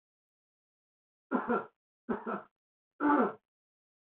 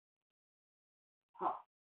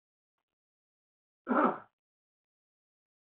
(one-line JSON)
{"three_cough_length": "4.2 s", "three_cough_amplitude": 5488, "three_cough_signal_mean_std_ratio": 0.34, "exhalation_length": "2.0 s", "exhalation_amplitude": 2045, "exhalation_signal_mean_std_ratio": 0.23, "cough_length": "3.3 s", "cough_amplitude": 5972, "cough_signal_mean_std_ratio": 0.22, "survey_phase": "beta (2021-08-13 to 2022-03-07)", "age": "18-44", "gender": "Male", "wearing_mask": "No", "symptom_runny_or_blocked_nose": true, "symptom_diarrhoea": true, "symptom_fatigue": true, "symptom_headache": true, "symptom_onset": "9 days", "smoker_status": "Current smoker (1 to 10 cigarettes per day)", "recruitment_source": "Test and Trace", "submission_delay": "2 days", "covid_test_result": "Positive", "covid_test_method": "RT-qPCR", "covid_ct_value": 19.1, "covid_ct_gene": "N gene"}